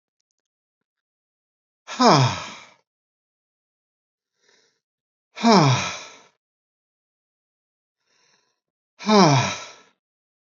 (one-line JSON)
{"exhalation_length": "10.5 s", "exhalation_amplitude": 27939, "exhalation_signal_mean_std_ratio": 0.28, "survey_phase": "alpha (2021-03-01 to 2021-08-12)", "age": "65+", "gender": "Male", "wearing_mask": "No", "symptom_none": true, "smoker_status": "Ex-smoker", "respiratory_condition_asthma": false, "respiratory_condition_other": false, "recruitment_source": "REACT", "submission_delay": "2 days", "covid_test_result": "Negative", "covid_test_method": "RT-qPCR"}